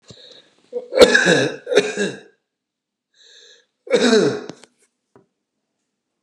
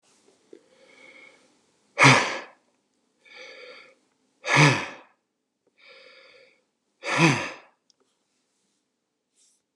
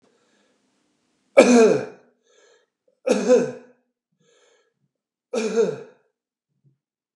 {
  "cough_length": "6.2 s",
  "cough_amplitude": 32768,
  "cough_signal_mean_std_ratio": 0.37,
  "exhalation_length": "9.8 s",
  "exhalation_amplitude": 26623,
  "exhalation_signal_mean_std_ratio": 0.26,
  "three_cough_length": "7.2 s",
  "three_cough_amplitude": 32768,
  "three_cough_signal_mean_std_ratio": 0.31,
  "survey_phase": "beta (2021-08-13 to 2022-03-07)",
  "age": "45-64",
  "gender": "Male",
  "wearing_mask": "No",
  "symptom_none": true,
  "smoker_status": "Ex-smoker",
  "respiratory_condition_asthma": false,
  "respiratory_condition_other": false,
  "recruitment_source": "REACT",
  "submission_delay": "1 day",
  "covid_test_result": "Negative",
  "covid_test_method": "RT-qPCR"
}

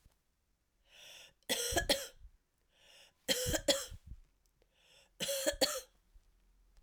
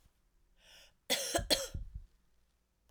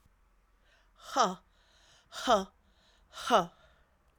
{
  "three_cough_length": "6.8 s",
  "three_cough_amplitude": 5940,
  "three_cough_signal_mean_std_ratio": 0.39,
  "cough_length": "2.9 s",
  "cough_amplitude": 5722,
  "cough_signal_mean_std_ratio": 0.38,
  "exhalation_length": "4.2 s",
  "exhalation_amplitude": 9406,
  "exhalation_signal_mean_std_ratio": 0.3,
  "survey_phase": "beta (2021-08-13 to 2022-03-07)",
  "age": "45-64",
  "gender": "Female",
  "wearing_mask": "No",
  "symptom_cough_any": true,
  "symptom_runny_or_blocked_nose": true,
  "symptom_fatigue": true,
  "symptom_headache": true,
  "smoker_status": "Never smoked",
  "respiratory_condition_asthma": false,
  "respiratory_condition_other": false,
  "recruitment_source": "Test and Trace",
  "submission_delay": "2 days",
  "covid_test_result": "Positive",
  "covid_test_method": "RT-qPCR",
  "covid_ct_value": 22.0,
  "covid_ct_gene": "ORF1ab gene",
  "covid_ct_mean": 22.2,
  "covid_viral_load": "51000 copies/ml",
  "covid_viral_load_category": "Low viral load (10K-1M copies/ml)"
}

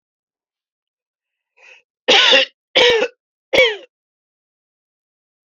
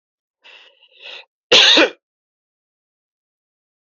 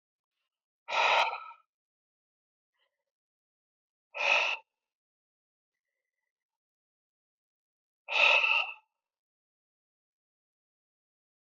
{
  "three_cough_length": "5.5 s",
  "three_cough_amplitude": 29177,
  "three_cough_signal_mean_std_ratio": 0.33,
  "cough_length": "3.8 s",
  "cough_amplitude": 30421,
  "cough_signal_mean_std_ratio": 0.27,
  "exhalation_length": "11.4 s",
  "exhalation_amplitude": 9190,
  "exhalation_signal_mean_std_ratio": 0.28,
  "survey_phase": "beta (2021-08-13 to 2022-03-07)",
  "age": "18-44",
  "gender": "Male",
  "wearing_mask": "No",
  "symptom_cough_any": true,
  "symptom_fatigue": true,
  "smoker_status": "Current smoker (e-cigarettes or vapes only)",
  "respiratory_condition_asthma": true,
  "respiratory_condition_other": false,
  "recruitment_source": "Test and Trace",
  "submission_delay": "3 days",
  "covid_test_result": "Positive",
  "covid_test_method": "LFT"
}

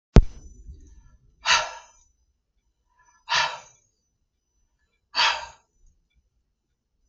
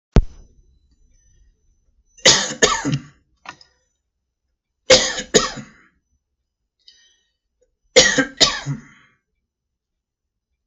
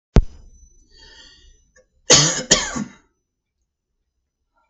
{
  "exhalation_length": "7.1 s",
  "exhalation_amplitude": 32768,
  "exhalation_signal_mean_std_ratio": 0.23,
  "three_cough_length": "10.7 s",
  "three_cough_amplitude": 32768,
  "three_cough_signal_mean_std_ratio": 0.28,
  "cough_length": "4.7 s",
  "cough_amplitude": 32768,
  "cough_signal_mean_std_ratio": 0.27,
  "survey_phase": "beta (2021-08-13 to 2022-03-07)",
  "age": "45-64",
  "gender": "Male",
  "wearing_mask": "No",
  "symptom_fatigue": true,
  "symptom_headache": true,
  "symptom_onset": "9 days",
  "smoker_status": "Never smoked",
  "respiratory_condition_asthma": false,
  "respiratory_condition_other": false,
  "recruitment_source": "REACT",
  "submission_delay": "2 days",
  "covid_test_result": "Negative",
  "covid_test_method": "RT-qPCR",
  "influenza_a_test_result": "Negative",
  "influenza_b_test_result": "Negative"
}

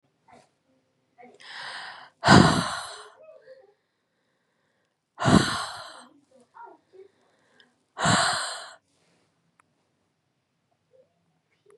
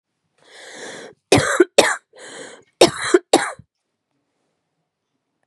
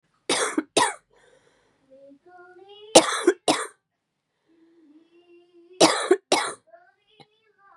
{
  "exhalation_length": "11.8 s",
  "exhalation_amplitude": 27885,
  "exhalation_signal_mean_std_ratio": 0.27,
  "cough_length": "5.5 s",
  "cough_amplitude": 32768,
  "cough_signal_mean_std_ratio": 0.3,
  "three_cough_length": "7.8 s",
  "three_cough_amplitude": 32767,
  "three_cough_signal_mean_std_ratio": 0.3,
  "survey_phase": "beta (2021-08-13 to 2022-03-07)",
  "age": "18-44",
  "gender": "Female",
  "wearing_mask": "No",
  "symptom_cough_any": true,
  "symptom_shortness_of_breath": true,
  "symptom_headache": true,
  "smoker_status": "Ex-smoker",
  "respiratory_condition_asthma": true,
  "respiratory_condition_other": false,
  "recruitment_source": "Test and Trace",
  "submission_delay": "1 day",
  "covid_test_result": "Positive",
  "covid_test_method": "LFT"
}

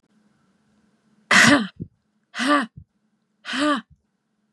{
  "exhalation_length": "4.5 s",
  "exhalation_amplitude": 28481,
  "exhalation_signal_mean_std_ratio": 0.35,
  "survey_phase": "beta (2021-08-13 to 2022-03-07)",
  "age": "18-44",
  "gender": "Female",
  "wearing_mask": "No",
  "symptom_none": true,
  "smoker_status": "Never smoked",
  "respiratory_condition_asthma": false,
  "respiratory_condition_other": false,
  "recruitment_source": "REACT",
  "submission_delay": "0 days",
  "covid_test_result": "Negative",
  "covid_test_method": "RT-qPCR",
  "influenza_a_test_result": "Negative",
  "influenza_b_test_result": "Negative"
}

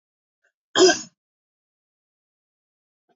{
  "cough_length": "3.2 s",
  "cough_amplitude": 22552,
  "cough_signal_mean_std_ratio": 0.21,
  "survey_phase": "beta (2021-08-13 to 2022-03-07)",
  "age": "65+",
  "gender": "Female",
  "wearing_mask": "No",
  "symptom_none": true,
  "smoker_status": "Never smoked",
  "respiratory_condition_asthma": false,
  "respiratory_condition_other": false,
  "recruitment_source": "REACT",
  "submission_delay": "1 day",
  "covid_test_result": "Negative",
  "covid_test_method": "RT-qPCR",
  "influenza_a_test_result": "Negative",
  "influenza_b_test_result": "Negative"
}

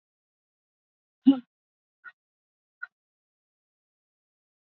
{
  "exhalation_length": "4.7 s",
  "exhalation_amplitude": 13680,
  "exhalation_signal_mean_std_ratio": 0.11,
  "survey_phase": "beta (2021-08-13 to 2022-03-07)",
  "age": "45-64",
  "gender": "Female",
  "wearing_mask": "No",
  "symptom_none": true,
  "smoker_status": "Ex-smoker",
  "respiratory_condition_asthma": false,
  "respiratory_condition_other": false,
  "recruitment_source": "REACT",
  "submission_delay": "1 day",
  "covid_test_result": "Negative",
  "covid_test_method": "RT-qPCR",
  "influenza_a_test_result": "Negative",
  "influenza_b_test_result": "Negative"
}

